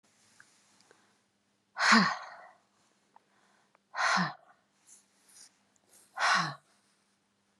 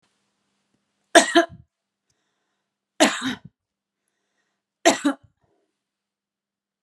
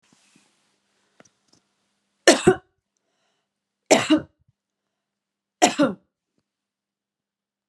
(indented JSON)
{
  "exhalation_length": "7.6 s",
  "exhalation_amplitude": 12324,
  "exhalation_signal_mean_std_ratio": 0.3,
  "cough_length": "6.8 s",
  "cough_amplitude": 32767,
  "cough_signal_mean_std_ratio": 0.22,
  "three_cough_length": "7.7 s",
  "three_cough_amplitude": 32259,
  "three_cough_signal_mean_std_ratio": 0.22,
  "survey_phase": "beta (2021-08-13 to 2022-03-07)",
  "age": "45-64",
  "gender": "Female",
  "wearing_mask": "No",
  "symptom_runny_or_blocked_nose": true,
  "symptom_headache": true,
  "smoker_status": "Never smoked",
  "respiratory_condition_asthma": false,
  "respiratory_condition_other": false,
  "recruitment_source": "Test and Trace",
  "submission_delay": "3 days",
  "covid_test_result": "Positive",
  "covid_test_method": "RT-qPCR",
  "covid_ct_value": 32.8,
  "covid_ct_gene": "N gene"
}